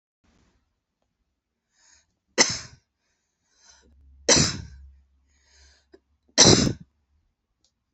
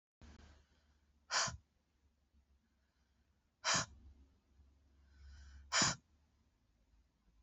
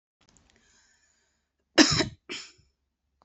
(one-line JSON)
{"three_cough_length": "7.9 s", "three_cough_amplitude": 28679, "three_cough_signal_mean_std_ratio": 0.24, "exhalation_length": "7.4 s", "exhalation_amplitude": 3508, "exhalation_signal_mean_std_ratio": 0.28, "cough_length": "3.2 s", "cough_amplitude": 25508, "cough_signal_mean_std_ratio": 0.22, "survey_phase": "beta (2021-08-13 to 2022-03-07)", "age": "45-64", "gender": "Female", "wearing_mask": "No", "symptom_cough_any": true, "symptom_runny_or_blocked_nose": true, "symptom_sore_throat": true, "symptom_fatigue": true, "symptom_fever_high_temperature": true, "smoker_status": "Ex-smoker", "respiratory_condition_asthma": false, "respiratory_condition_other": false, "recruitment_source": "Test and Trace", "submission_delay": "1 day", "covid_test_result": "Positive", "covid_test_method": "LFT"}